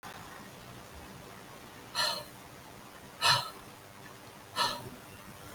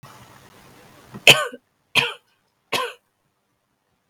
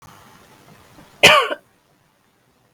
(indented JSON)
{
  "exhalation_length": "5.5 s",
  "exhalation_amplitude": 7668,
  "exhalation_signal_mean_std_ratio": 0.47,
  "three_cough_length": "4.1 s",
  "three_cough_amplitude": 32768,
  "three_cough_signal_mean_std_ratio": 0.23,
  "cough_length": "2.7 s",
  "cough_amplitude": 32768,
  "cough_signal_mean_std_ratio": 0.26,
  "survey_phase": "beta (2021-08-13 to 2022-03-07)",
  "age": "18-44",
  "gender": "Female",
  "wearing_mask": "No",
  "symptom_cough_any": true,
  "symptom_new_continuous_cough": true,
  "symptom_sore_throat": true,
  "symptom_fatigue": true,
  "symptom_fever_high_temperature": true,
  "symptom_headache": true,
  "symptom_onset": "2 days",
  "smoker_status": "Never smoked",
  "respiratory_condition_asthma": false,
  "respiratory_condition_other": false,
  "recruitment_source": "Test and Trace",
  "submission_delay": "1 day",
  "covid_test_result": "Positive",
  "covid_test_method": "RT-qPCR",
  "covid_ct_value": 28.9,
  "covid_ct_gene": "N gene"
}